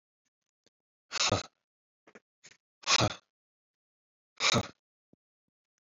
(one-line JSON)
{"exhalation_length": "5.8 s", "exhalation_amplitude": 9014, "exhalation_signal_mean_std_ratio": 0.27, "survey_phase": "beta (2021-08-13 to 2022-03-07)", "age": "18-44", "gender": "Male", "wearing_mask": "No", "symptom_runny_or_blocked_nose": true, "symptom_sore_throat": true, "symptom_fatigue": true, "symptom_headache": true, "symptom_other": true, "symptom_onset": "3 days", "smoker_status": "Never smoked", "respiratory_condition_asthma": false, "respiratory_condition_other": false, "recruitment_source": "Test and Trace", "submission_delay": "2 days", "covid_test_result": "Positive", "covid_test_method": "RT-qPCR", "covid_ct_value": 29.3, "covid_ct_gene": "N gene"}